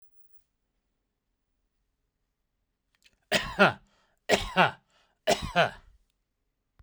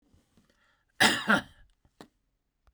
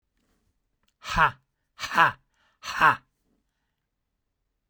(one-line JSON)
{"three_cough_length": "6.8 s", "three_cough_amplitude": 18147, "three_cough_signal_mean_std_ratio": 0.27, "cough_length": "2.7 s", "cough_amplitude": 14393, "cough_signal_mean_std_ratio": 0.28, "exhalation_length": "4.7 s", "exhalation_amplitude": 22632, "exhalation_signal_mean_std_ratio": 0.26, "survey_phase": "beta (2021-08-13 to 2022-03-07)", "age": "45-64", "gender": "Male", "wearing_mask": "No", "symptom_none": true, "smoker_status": "Never smoked", "respiratory_condition_asthma": false, "respiratory_condition_other": false, "recruitment_source": "REACT", "submission_delay": "1 day", "covid_test_result": "Negative", "covid_test_method": "RT-qPCR"}